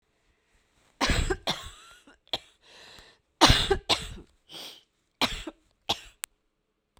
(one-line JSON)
{"cough_length": "7.0 s", "cough_amplitude": 26659, "cough_signal_mean_std_ratio": 0.32, "survey_phase": "beta (2021-08-13 to 2022-03-07)", "age": "45-64", "gender": "Female", "wearing_mask": "No", "symptom_cough_any": true, "symptom_new_continuous_cough": true, "symptom_runny_or_blocked_nose": true, "symptom_shortness_of_breath": true, "symptom_sore_throat": true, "symptom_fatigue": true, "symptom_headache": true, "symptom_change_to_sense_of_smell_or_taste": true, "symptom_loss_of_taste": true, "symptom_onset": "3 days", "smoker_status": "Never smoked", "respiratory_condition_asthma": true, "respiratory_condition_other": false, "recruitment_source": "Test and Trace", "submission_delay": "2 days", "covid_test_result": "Positive", "covid_test_method": "RT-qPCR", "covid_ct_value": 19.4, "covid_ct_gene": "ORF1ab gene", "covid_ct_mean": 20.1, "covid_viral_load": "260000 copies/ml", "covid_viral_load_category": "Low viral load (10K-1M copies/ml)"}